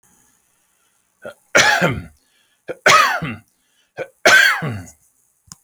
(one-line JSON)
{"three_cough_length": "5.6 s", "three_cough_amplitude": 32768, "three_cough_signal_mean_std_ratio": 0.39, "survey_phase": "beta (2021-08-13 to 2022-03-07)", "age": "45-64", "gender": "Male", "wearing_mask": "No", "symptom_none": true, "smoker_status": "Never smoked", "respiratory_condition_asthma": false, "respiratory_condition_other": false, "recruitment_source": "REACT", "submission_delay": "2 days", "covid_test_result": "Negative", "covid_test_method": "RT-qPCR"}